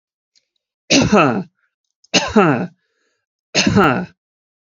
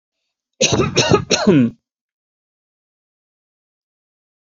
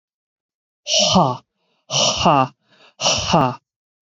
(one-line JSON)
{"three_cough_length": "4.6 s", "three_cough_amplitude": 30350, "three_cough_signal_mean_std_ratio": 0.45, "cough_length": "4.5 s", "cough_amplitude": 31156, "cough_signal_mean_std_ratio": 0.36, "exhalation_length": "4.0 s", "exhalation_amplitude": 27603, "exhalation_signal_mean_std_ratio": 0.49, "survey_phase": "beta (2021-08-13 to 2022-03-07)", "age": "18-44", "gender": "Male", "wearing_mask": "No", "symptom_none": true, "smoker_status": "Never smoked", "respiratory_condition_asthma": false, "respiratory_condition_other": false, "recruitment_source": "REACT", "submission_delay": "1 day", "covid_test_result": "Negative", "covid_test_method": "RT-qPCR", "influenza_a_test_result": "Negative", "influenza_b_test_result": "Negative"}